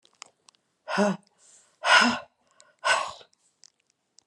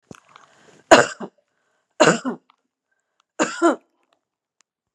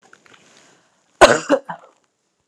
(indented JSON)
{
  "exhalation_length": "4.3 s",
  "exhalation_amplitude": 19773,
  "exhalation_signal_mean_std_ratio": 0.34,
  "three_cough_length": "4.9 s",
  "three_cough_amplitude": 32768,
  "three_cough_signal_mean_std_ratio": 0.26,
  "cough_length": "2.5 s",
  "cough_amplitude": 32768,
  "cough_signal_mean_std_ratio": 0.25,
  "survey_phase": "alpha (2021-03-01 to 2021-08-12)",
  "age": "45-64",
  "gender": "Female",
  "wearing_mask": "No",
  "symptom_none": true,
  "smoker_status": "Never smoked",
  "respiratory_condition_asthma": false,
  "respiratory_condition_other": false,
  "recruitment_source": "REACT",
  "submission_delay": "0 days",
  "covid_test_result": "Negative",
  "covid_test_method": "RT-qPCR"
}